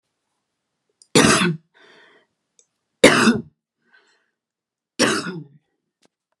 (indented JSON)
{
  "three_cough_length": "6.4 s",
  "three_cough_amplitude": 32768,
  "three_cough_signal_mean_std_ratio": 0.3,
  "survey_phase": "beta (2021-08-13 to 2022-03-07)",
  "age": "45-64",
  "gender": "Female",
  "wearing_mask": "No",
  "symptom_none": true,
  "symptom_onset": "12 days",
  "smoker_status": "Never smoked",
  "respiratory_condition_asthma": false,
  "respiratory_condition_other": false,
  "recruitment_source": "REACT",
  "submission_delay": "1 day",
  "covid_test_result": "Negative",
  "covid_test_method": "RT-qPCR"
}